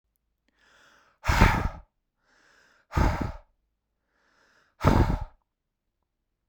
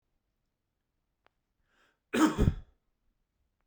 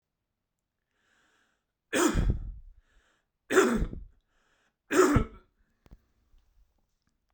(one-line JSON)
{"exhalation_length": "6.5 s", "exhalation_amplitude": 21795, "exhalation_signal_mean_std_ratio": 0.32, "cough_length": "3.7 s", "cough_amplitude": 8789, "cough_signal_mean_std_ratio": 0.24, "three_cough_length": "7.3 s", "three_cough_amplitude": 11968, "three_cough_signal_mean_std_ratio": 0.34, "survey_phase": "beta (2021-08-13 to 2022-03-07)", "age": "18-44", "gender": "Male", "wearing_mask": "No", "symptom_none": true, "symptom_onset": "12 days", "smoker_status": "Never smoked", "respiratory_condition_asthma": false, "respiratory_condition_other": false, "recruitment_source": "REACT", "submission_delay": "0 days", "covid_test_result": "Negative", "covid_test_method": "RT-qPCR"}